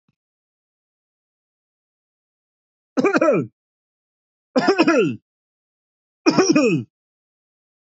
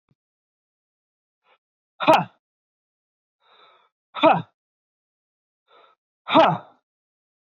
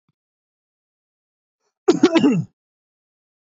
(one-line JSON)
{"three_cough_length": "7.9 s", "three_cough_amplitude": 25086, "three_cough_signal_mean_std_ratio": 0.36, "exhalation_length": "7.6 s", "exhalation_amplitude": 22658, "exhalation_signal_mean_std_ratio": 0.23, "cough_length": "3.6 s", "cough_amplitude": 26717, "cough_signal_mean_std_ratio": 0.28, "survey_phase": "beta (2021-08-13 to 2022-03-07)", "age": "18-44", "gender": "Male", "wearing_mask": "No", "symptom_none": true, "smoker_status": "Never smoked", "respiratory_condition_asthma": false, "respiratory_condition_other": false, "recruitment_source": "REACT", "submission_delay": "34 days", "covid_test_result": "Negative", "covid_test_method": "RT-qPCR", "influenza_a_test_result": "Negative", "influenza_b_test_result": "Negative"}